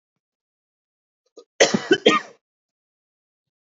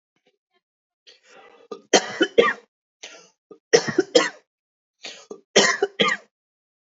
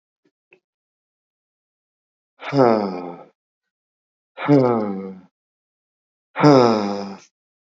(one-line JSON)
{"cough_length": "3.8 s", "cough_amplitude": 30101, "cough_signal_mean_std_ratio": 0.24, "three_cough_length": "6.8 s", "three_cough_amplitude": 30572, "three_cough_signal_mean_std_ratio": 0.31, "exhalation_length": "7.7 s", "exhalation_amplitude": 28274, "exhalation_signal_mean_std_ratio": 0.36, "survey_phase": "beta (2021-08-13 to 2022-03-07)", "age": "18-44", "gender": "Male", "wearing_mask": "No", "symptom_none": true, "smoker_status": "Never smoked", "respiratory_condition_asthma": false, "respiratory_condition_other": false, "recruitment_source": "REACT", "submission_delay": "1 day", "covid_test_result": "Negative", "covid_test_method": "RT-qPCR", "influenza_a_test_result": "Negative", "influenza_b_test_result": "Negative"}